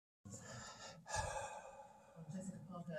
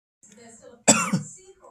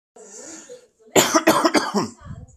{"exhalation_length": "3.0 s", "exhalation_amplitude": 1201, "exhalation_signal_mean_std_ratio": 0.79, "cough_length": "1.7 s", "cough_amplitude": 30074, "cough_signal_mean_std_ratio": 0.34, "three_cough_length": "2.6 s", "three_cough_amplitude": 28874, "three_cough_signal_mean_std_ratio": 0.47, "survey_phase": "beta (2021-08-13 to 2022-03-07)", "age": "45-64", "gender": "Male", "wearing_mask": "No", "symptom_none": true, "smoker_status": "Never smoked", "respiratory_condition_asthma": false, "respiratory_condition_other": false, "recruitment_source": "REACT", "submission_delay": "3 days", "covid_test_result": "Negative", "covid_test_method": "RT-qPCR", "influenza_a_test_result": "Negative", "influenza_b_test_result": "Negative"}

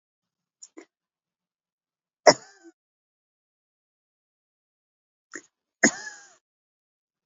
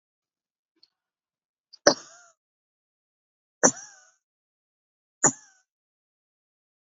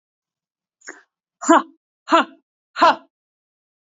{"cough_length": "7.3 s", "cough_amplitude": 29852, "cough_signal_mean_std_ratio": 0.11, "three_cough_length": "6.8 s", "three_cough_amplitude": 29424, "three_cough_signal_mean_std_ratio": 0.14, "exhalation_length": "3.8 s", "exhalation_amplitude": 28445, "exhalation_signal_mean_std_ratio": 0.27, "survey_phase": "beta (2021-08-13 to 2022-03-07)", "age": "45-64", "gender": "Female", "wearing_mask": "No", "symptom_none": true, "smoker_status": "Ex-smoker", "respiratory_condition_asthma": false, "respiratory_condition_other": false, "recruitment_source": "Test and Trace", "submission_delay": "0 days", "covid_test_result": "Negative", "covid_test_method": "LFT"}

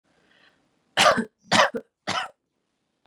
{"three_cough_length": "3.1 s", "three_cough_amplitude": 19637, "three_cough_signal_mean_std_ratio": 0.33, "survey_phase": "beta (2021-08-13 to 2022-03-07)", "age": "18-44", "gender": "Female", "wearing_mask": "No", "symptom_runny_or_blocked_nose": true, "symptom_fatigue": true, "symptom_headache": true, "smoker_status": "Ex-smoker", "respiratory_condition_asthma": false, "respiratory_condition_other": false, "recruitment_source": "Test and Trace", "submission_delay": "1 day", "covid_test_result": "Positive", "covid_test_method": "RT-qPCR", "covid_ct_value": 19.5, "covid_ct_gene": "ORF1ab gene"}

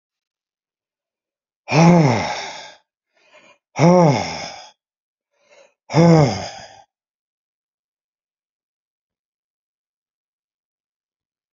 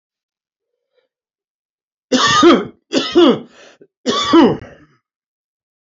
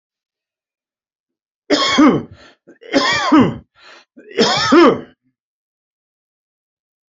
{"exhalation_length": "11.5 s", "exhalation_amplitude": 31893, "exhalation_signal_mean_std_ratio": 0.31, "cough_length": "5.8 s", "cough_amplitude": 29431, "cough_signal_mean_std_ratio": 0.4, "three_cough_length": "7.1 s", "three_cough_amplitude": 30098, "three_cough_signal_mean_std_ratio": 0.4, "survey_phase": "alpha (2021-03-01 to 2021-08-12)", "age": "65+", "gender": "Male", "wearing_mask": "No", "symptom_none": true, "smoker_status": "Ex-smoker", "respiratory_condition_asthma": false, "respiratory_condition_other": false, "recruitment_source": "REACT", "submission_delay": "2 days", "covid_test_result": "Negative", "covid_test_method": "RT-qPCR"}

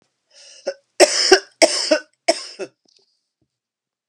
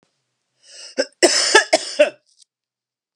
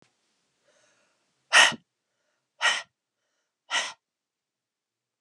{"three_cough_length": "4.1 s", "three_cough_amplitude": 32768, "three_cough_signal_mean_std_ratio": 0.32, "cough_length": "3.2 s", "cough_amplitude": 32767, "cough_signal_mean_std_ratio": 0.35, "exhalation_length": "5.2 s", "exhalation_amplitude": 18966, "exhalation_signal_mean_std_ratio": 0.22, "survey_phase": "alpha (2021-03-01 to 2021-08-12)", "age": "45-64", "gender": "Female", "wearing_mask": "No", "symptom_cough_any": true, "symptom_onset": "4 days", "smoker_status": "Never smoked", "respiratory_condition_asthma": false, "respiratory_condition_other": false, "recruitment_source": "Test and Trace", "submission_delay": "1 day", "covid_test_result": "Positive", "covid_test_method": "RT-qPCR"}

